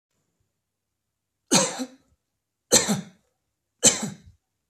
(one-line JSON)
{"three_cough_length": "4.7 s", "three_cough_amplitude": 26590, "three_cough_signal_mean_std_ratio": 0.29, "survey_phase": "beta (2021-08-13 to 2022-03-07)", "age": "45-64", "gender": "Male", "wearing_mask": "No", "symptom_none": true, "smoker_status": "Never smoked", "respiratory_condition_asthma": false, "respiratory_condition_other": false, "recruitment_source": "REACT", "submission_delay": "2 days", "covid_test_result": "Negative", "covid_test_method": "RT-qPCR"}